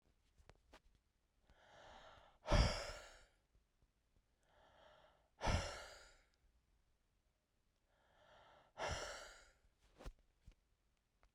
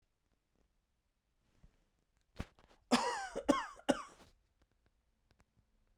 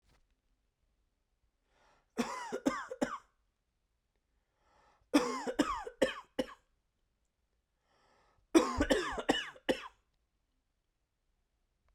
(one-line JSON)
{"exhalation_length": "11.3 s", "exhalation_amplitude": 2714, "exhalation_signal_mean_std_ratio": 0.27, "cough_length": "6.0 s", "cough_amplitude": 5630, "cough_signal_mean_std_ratio": 0.25, "three_cough_length": "11.9 s", "three_cough_amplitude": 9713, "three_cough_signal_mean_std_ratio": 0.31, "survey_phase": "beta (2021-08-13 to 2022-03-07)", "age": "18-44", "gender": "Male", "wearing_mask": "No", "symptom_cough_any": true, "symptom_shortness_of_breath": true, "symptom_fatigue": true, "symptom_headache": true, "symptom_change_to_sense_of_smell_or_taste": true, "smoker_status": "Ex-smoker", "respiratory_condition_asthma": false, "respiratory_condition_other": false, "recruitment_source": "Test and Trace", "submission_delay": "2 days", "covid_test_result": "Positive", "covid_test_method": "RT-qPCR", "covid_ct_value": 16.9, "covid_ct_gene": "ORF1ab gene"}